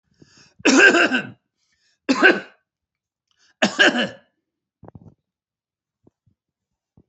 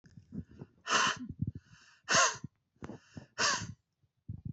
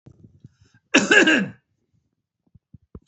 {"three_cough_length": "7.1 s", "three_cough_amplitude": 30022, "three_cough_signal_mean_std_ratio": 0.32, "exhalation_length": "4.5 s", "exhalation_amplitude": 6951, "exhalation_signal_mean_std_ratio": 0.42, "cough_length": "3.1 s", "cough_amplitude": 25940, "cough_signal_mean_std_ratio": 0.32, "survey_phase": "beta (2021-08-13 to 2022-03-07)", "age": "65+", "gender": "Male", "wearing_mask": "No", "symptom_none": true, "smoker_status": "Never smoked", "respiratory_condition_asthma": false, "respiratory_condition_other": false, "recruitment_source": "REACT", "submission_delay": "1 day", "covid_test_result": "Negative", "covid_test_method": "RT-qPCR", "influenza_a_test_result": "Negative", "influenza_b_test_result": "Negative"}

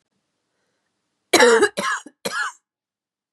{"three_cough_length": "3.3 s", "three_cough_amplitude": 30261, "three_cough_signal_mean_std_ratio": 0.35, "survey_phase": "beta (2021-08-13 to 2022-03-07)", "age": "18-44", "gender": "Female", "wearing_mask": "No", "symptom_cough_any": true, "symptom_new_continuous_cough": true, "symptom_runny_or_blocked_nose": true, "symptom_shortness_of_breath": true, "symptom_diarrhoea": true, "symptom_fatigue": true, "symptom_headache": true, "symptom_onset": "3 days", "smoker_status": "Ex-smoker", "respiratory_condition_asthma": false, "respiratory_condition_other": false, "recruitment_source": "Test and Trace", "submission_delay": "2 days", "covid_test_result": "Positive", "covid_test_method": "RT-qPCR", "covid_ct_value": 21.9, "covid_ct_gene": "ORF1ab gene", "covid_ct_mean": 22.0, "covid_viral_load": "60000 copies/ml", "covid_viral_load_category": "Low viral load (10K-1M copies/ml)"}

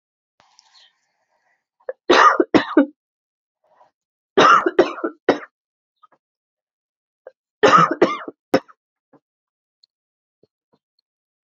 {"three_cough_length": "11.4 s", "three_cough_amplitude": 28447, "three_cough_signal_mean_std_ratio": 0.29, "survey_phase": "alpha (2021-03-01 to 2021-08-12)", "age": "18-44", "gender": "Female", "wearing_mask": "No", "symptom_new_continuous_cough": true, "symptom_shortness_of_breath": true, "symptom_fatigue": true, "symptom_change_to_sense_of_smell_or_taste": true, "symptom_loss_of_taste": true, "symptom_onset": "6 days", "smoker_status": "Never smoked", "respiratory_condition_asthma": false, "respiratory_condition_other": false, "recruitment_source": "Test and Trace", "submission_delay": "3 days", "covid_test_result": "Positive", "covid_test_method": "RT-qPCR", "covid_ct_value": 14.7, "covid_ct_gene": "ORF1ab gene", "covid_ct_mean": 14.8, "covid_viral_load": "14000000 copies/ml", "covid_viral_load_category": "High viral load (>1M copies/ml)"}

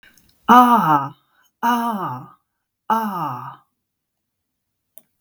{"exhalation_length": "5.2 s", "exhalation_amplitude": 32767, "exhalation_signal_mean_std_ratio": 0.4, "survey_phase": "beta (2021-08-13 to 2022-03-07)", "age": "65+", "gender": "Female", "wearing_mask": "No", "symptom_none": true, "symptom_onset": "12 days", "smoker_status": "Never smoked", "respiratory_condition_asthma": false, "respiratory_condition_other": false, "recruitment_source": "REACT", "submission_delay": "1 day", "covid_test_result": "Negative", "covid_test_method": "RT-qPCR", "influenza_a_test_result": "Unknown/Void", "influenza_b_test_result": "Unknown/Void"}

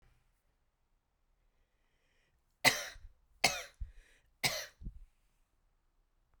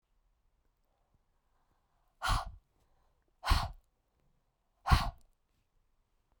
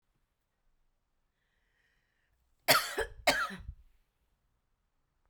{"three_cough_length": "6.4 s", "three_cough_amplitude": 10622, "three_cough_signal_mean_std_ratio": 0.23, "exhalation_length": "6.4 s", "exhalation_amplitude": 9244, "exhalation_signal_mean_std_ratio": 0.24, "cough_length": "5.3 s", "cough_amplitude": 10212, "cough_signal_mean_std_ratio": 0.25, "survey_phase": "beta (2021-08-13 to 2022-03-07)", "age": "18-44", "gender": "Female", "wearing_mask": "No", "symptom_none": true, "smoker_status": "Never smoked", "respiratory_condition_asthma": false, "respiratory_condition_other": false, "recruitment_source": "REACT", "submission_delay": "3 days", "covid_test_result": "Negative", "covid_test_method": "RT-qPCR"}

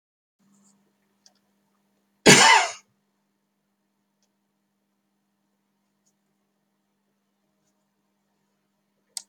{"cough_length": "9.3 s", "cough_amplitude": 29808, "cough_signal_mean_std_ratio": 0.17, "survey_phase": "beta (2021-08-13 to 2022-03-07)", "age": "65+", "gender": "Male", "wearing_mask": "No", "symptom_loss_of_taste": true, "smoker_status": "Never smoked", "respiratory_condition_asthma": false, "respiratory_condition_other": false, "recruitment_source": "REACT", "submission_delay": "4 days", "covid_test_result": "Negative", "covid_test_method": "RT-qPCR"}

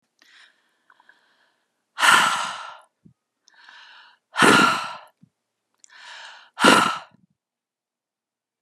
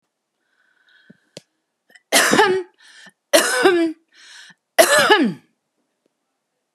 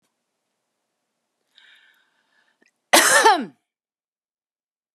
{"exhalation_length": "8.6 s", "exhalation_amplitude": 32342, "exhalation_signal_mean_std_ratio": 0.32, "three_cough_length": "6.7 s", "three_cough_amplitude": 32766, "three_cough_signal_mean_std_ratio": 0.4, "cough_length": "4.9 s", "cough_amplitude": 32341, "cough_signal_mean_std_ratio": 0.25, "survey_phase": "beta (2021-08-13 to 2022-03-07)", "age": "65+", "gender": "Female", "wearing_mask": "No", "symptom_none": true, "smoker_status": "Never smoked", "respiratory_condition_asthma": false, "respiratory_condition_other": false, "recruitment_source": "REACT", "submission_delay": "3 days", "covid_test_result": "Negative", "covid_test_method": "RT-qPCR"}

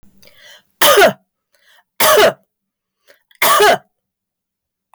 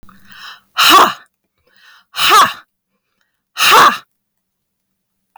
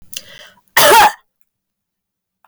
{"three_cough_length": "4.9 s", "three_cough_amplitude": 32768, "three_cough_signal_mean_std_ratio": 0.41, "exhalation_length": "5.4 s", "exhalation_amplitude": 32768, "exhalation_signal_mean_std_ratio": 0.4, "cough_length": "2.5 s", "cough_amplitude": 32768, "cough_signal_mean_std_ratio": 0.36, "survey_phase": "beta (2021-08-13 to 2022-03-07)", "age": "45-64", "gender": "Female", "wearing_mask": "No", "symptom_other": true, "smoker_status": "Never smoked", "respiratory_condition_asthma": false, "respiratory_condition_other": false, "recruitment_source": "REACT", "submission_delay": "1 day", "covid_test_result": "Negative", "covid_test_method": "RT-qPCR", "influenza_a_test_result": "Negative", "influenza_b_test_result": "Negative"}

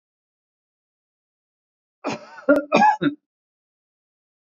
{"cough_length": "4.5 s", "cough_amplitude": 25254, "cough_signal_mean_std_ratio": 0.28, "survey_phase": "beta (2021-08-13 to 2022-03-07)", "age": "45-64", "gender": "Male", "wearing_mask": "No", "symptom_none": true, "smoker_status": "Never smoked", "respiratory_condition_asthma": false, "respiratory_condition_other": false, "recruitment_source": "REACT", "submission_delay": "1 day", "covid_test_result": "Negative", "covid_test_method": "RT-qPCR", "influenza_a_test_result": "Negative", "influenza_b_test_result": "Negative"}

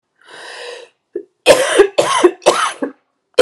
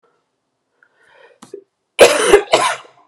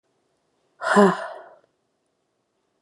{"three_cough_length": "3.4 s", "three_cough_amplitude": 32768, "three_cough_signal_mean_std_ratio": 0.46, "cough_length": "3.1 s", "cough_amplitude": 32768, "cough_signal_mean_std_ratio": 0.35, "exhalation_length": "2.8 s", "exhalation_amplitude": 25925, "exhalation_signal_mean_std_ratio": 0.28, "survey_phase": "beta (2021-08-13 to 2022-03-07)", "age": "18-44", "gender": "Female", "wearing_mask": "No", "symptom_cough_any": true, "symptom_new_continuous_cough": true, "symptom_fatigue": true, "symptom_headache": true, "symptom_change_to_sense_of_smell_or_taste": true, "symptom_loss_of_taste": true, "symptom_onset": "7 days", "smoker_status": "Never smoked", "respiratory_condition_asthma": false, "respiratory_condition_other": false, "recruitment_source": "Test and Trace", "submission_delay": "2 days", "covid_test_result": "Positive", "covid_test_method": "RT-qPCR"}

